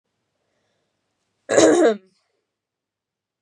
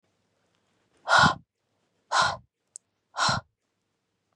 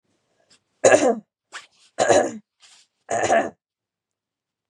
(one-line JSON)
{"cough_length": "3.4 s", "cough_amplitude": 26807, "cough_signal_mean_std_ratio": 0.3, "exhalation_length": "4.4 s", "exhalation_amplitude": 16557, "exhalation_signal_mean_std_ratio": 0.31, "three_cough_length": "4.7 s", "three_cough_amplitude": 25990, "three_cough_signal_mean_std_ratio": 0.36, "survey_phase": "beta (2021-08-13 to 2022-03-07)", "age": "18-44", "gender": "Female", "wearing_mask": "No", "symptom_fatigue": true, "symptom_headache": true, "symptom_onset": "12 days", "smoker_status": "Current smoker (1 to 10 cigarettes per day)", "respiratory_condition_asthma": false, "respiratory_condition_other": false, "recruitment_source": "REACT", "submission_delay": "1 day", "covid_test_result": "Positive", "covid_test_method": "RT-qPCR", "covid_ct_value": 25.0, "covid_ct_gene": "E gene", "influenza_a_test_result": "Negative", "influenza_b_test_result": "Negative"}